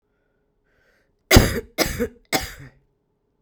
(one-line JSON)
{"three_cough_length": "3.4 s", "three_cough_amplitude": 32768, "three_cough_signal_mean_std_ratio": 0.29, "survey_phase": "beta (2021-08-13 to 2022-03-07)", "age": "18-44", "gender": "Female", "wearing_mask": "No", "symptom_cough_any": true, "symptom_runny_or_blocked_nose": true, "symptom_abdominal_pain": true, "symptom_headache": true, "symptom_loss_of_taste": true, "smoker_status": "Current smoker (1 to 10 cigarettes per day)", "respiratory_condition_asthma": false, "respiratory_condition_other": false, "recruitment_source": "Test and Trace", "submission_delay": "2 days", "covid_test_result": "Positive", "covid_test_method": "RT-qPCR", "covid_ct_value": 19.7, "covid_ct_gene": "ORF1ab gene", "covid_ct_mean": 20.4, "covid_viral_load": "200000 copies/ml", "covid_viral_load_category": "Low viral load (10K-1M copies/ml)"}